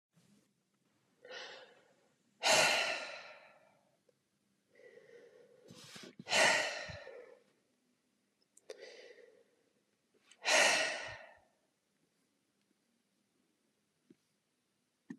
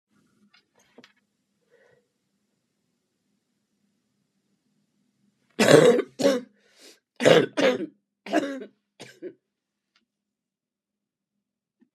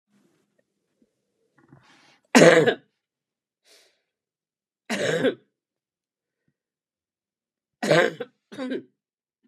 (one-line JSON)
{"exhalation_length": "15.2 s", "exhalation_amplitude": 5629, "exhalation_signal_mean_std_ratio": 0.3, "cough_length": "11.9 s", "cough_amplitude": 30701, "cough_signal_mean_std_ratio": 0.25, "three_cough_length": "9.5 s", "three_cough_amplitude": 30740, "three_cough_signal_mean_std_ratio": 0.25, "survey_phase": "beta (2021-08-13 to 2022-03-07)", "age": "65+", "gender": "Female", "wearing_mask": "No", "symptom_cough_any": true, "symptom_new_continuous_cough": true, "symptom_runny_or_blocked_nose": true, "symptom_sore_throat": true, "symptom_abdominal_pain": true, "symptom_fatigue": true, "symptom_headache": true, "symptom_onset": "6 days", "smoker_status": "Never smoked", "respiratory_condition_asthma": false, "respiratory_condition_other": true, "recruitment_source": "Test and Trace", "submission_delay": "2 days", "covid_test_result": "Negative", "covid_test_method": "RT-qPCR"}